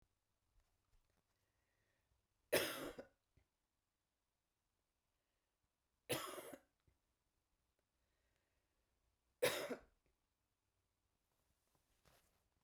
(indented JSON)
{
  "three_cough_length": "12.6 s",
  "three_cough_amplitude": 2639,
  "three_cough_signal_mean_std_ratio": 0.21,
  "survey_phase": "beta (2021-08-13 to 2022-03-07)",
  "age": "65+",
  "gender": "Female",
  "wearing_mask": "No",
  "symptom_none": true,
  "smoker_status": "Never smoked",
  "respiratory_condition_asthma": false,
  "respiratory_condition_other": false,
  "recruitment_source": "REACT",
  "submission_delay": "2 days",
  "covid_test_result": "Negative",
  "covid_test_method": "RT-qPCR"
}